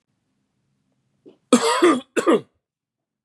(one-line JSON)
{"cough_length": "3.2 s", "cough_amplitude": 31640, "cough_signal_mean_std_ratio": 0.36, "survey_phase": "beta (2021-08-13 to 2022-03-07)", "age": "45-64", "gender": "Male", "wearing_mask": "No", "symptom_none": true, "smoker_status": "Never smoked", "respiratory_condition_asthma": false, "respiratory_condition_other": false, "recruitment_source": "REACT", "submission_delay": "0 days", "covid_test_result": "Negative", "covid_test_method": "RT-qPCR", "influenza_a_test_result": "Negative", "influenza_b_test_result": "Negative"}